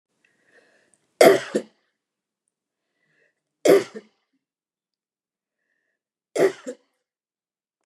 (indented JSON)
{
  "three_cough_length": "7.9 s",
  "three_cough_amplitude": 29204,
  "three_cough_signal_mean_std_ratio": 0.21,
  "survey_phase": "beta (2021-08-13 to 2022-03-07)",
  "age": "65+",
  "gender": "Female",
  "wearing_mask": "No",
  "symptom_none": true,
  "smoker_status": "Never smoked",
  "respiratory_condition_asthma": false,
  "respiratory_condition_other": false,
  "recruitment_source": "REACT",
  "submission_delay": "2 days",
  "covid_test_result": "Negative",
  "covid_test_method": "RT-qPCR",
  "influenza_a_test_result": "Negative",
  "influenza_b_test_result": "Negative"
}